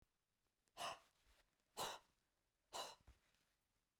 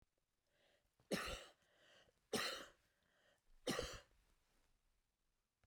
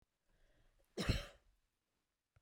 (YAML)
exhalation_length: 4.0 s
exhalation_amplitude: 628
exhalation_signal_mean_std_ratio: 0.33
three_cough_length: 5.7 s
three_cough_amplitude: 1280
three_cough_signal_mean_std_ratio: 0.34
cough_length: 2.4 s
cough_amplitude: 2224
cough_signal_mean_std_ratio: 0.26
survey_phase: beta (2021-08-13 to 2022-03-07)
age: 65+
gender: Female
wearing_mask: 'No'
symptom_none: true
smoker_status: Never smoked
respiratory_condition_asthma: false
respiratory_condition_other: false
recruitment_source: REACT
submission_delay: 2 days
covid_test_result: Negative
covid_test_method: RT-qPCR